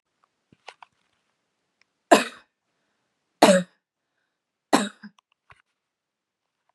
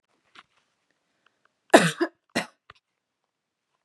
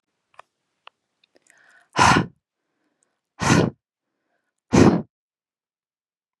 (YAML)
three_cough_length: 6.7 s
three_cough_amplitude: 32767
three_cough_signal_mean_std_ratio: 0.19
cough_length: 3.8 s
cough_amplitude: 32034
cough_signal_mean_std_ratio: 0.18
exhalation_length: 6.4 s
exhalation_amplitude: 27772
exhalation_signal_mean_std_ratio: 0.28
survey_phase: beta (2021-08-13 to 2022-03-07)
age: 18-44
gender: Female
wearing_mask: 'No'
symptom_none: true
smoker_status: Never smoked
respiratory_condition_asthma: false
respiratory_condition_other: false
recruitment_source: REACT
submission_delay: 1 day
covid_test_result: Negative
covid_test_method: RT-qPCR
influenza_a_test_result: Negative
influenza_b_test_result: Negative